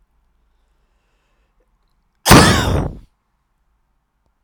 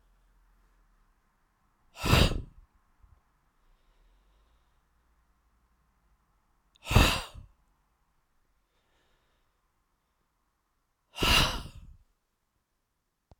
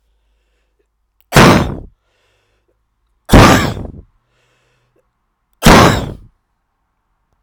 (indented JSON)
{
  "cough_length": "4.4 s",
  "cough_amplitude": 32768,
  "cough_signal_mean_std_ratio": 0.27,
  "exhalation_length": "13.4 s",
  "exhalation_amplitude": 18838,
  "exhalation_signal_mean_std_ratio": 0.23,
  "three_cough_length": "7.4 s",
  "three_cough_amplitude": 32768,
  "three_cough_signal_mean_std_ratio": 0.33,
  "survey_phase": "beta (2021-08-13 to 2022-03-07)",
  "age": "45-64",
  "gender": "Male",
  "wearing_mask": "No",
  "symptom_cough_any": true,
  "symptom_runny_or_blocked_nose": true,
  "symptom_fatigue": true,
  "smoker_status": "Never smoked",
  "respiratory_condition_asthma": false,
  "respiratory_condition_other": false,
  "recruitment_source": "Test and Trace",
  "submission_delay": "2 days",
  "covid_test_result": "Positive",
  "covid_test_method": "RT-qPCR"
}